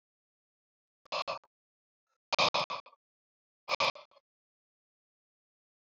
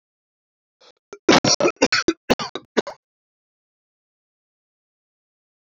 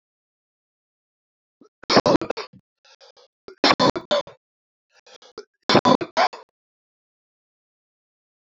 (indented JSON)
{
  "exhalation_length": "6.0 s",
  "exhalation_amplitude": 6878,
  "exhalation_signal_mean_std_ratio": 0.25,
  "cough_length": "5.7 s",
  "cough_amplitude": 30789,
  "cough_signal_mean_std_ratio": 0.26,
  "three_cough_length": "8.5 s",
  "three_cough_amplitude": 28030,
  "three_cough_signal_mean_std_ratio": 0.27,
  "survey_phase": "beta (2021-08-13 to 2022-03-07)",
  "age": "18-44",
  "gender": "Male",
  "wearing_mask": "No",
  "symptom_fever_high_temperature": true,
  "symptom_headache": true,
  "symptom_onset": "2 days",
  "smoker_status": "Never smoked",
  "respiratory_condition_asthma": false,
  "respiratory_condition_other": false,
  "recruitment_source": "Test and Trace",
  "submission_delay": "2 days",
  "covid_test_result": "Positive",
  "covid_test_method": "RT-qPCR",
  "covid_ct_value": 12.4,
  "covid_ct_gene": "ORF1ab gene",
  "covid_ct_mean": 13.6,
  "covid_viral_load": "35000000 copies/ml",
  "covid_viral_load_category": "High viral load (>1M copies/ml)"
}